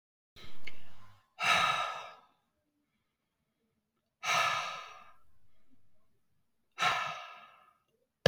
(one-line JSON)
{"exhalation_length": "8.3 s", "exhalation_amplitude": 13217, "exhalation_signal_mean_std_ratio": 0.46, "survey_phase": "beta (2021-08-13 to 2022-03-07)", "age": "65+", "gender": "Female", "wearing_mask": "No", "symptom_none": true, "smoker_status": "Never smoked", "respiratory_condition_asthma": false, "respiratory_condition_other": false, "recruitment_source": "REACT", "submission_delay": "3 days", "covid_test_result": "Negative", "covid_test_method": "RT-qPCR"}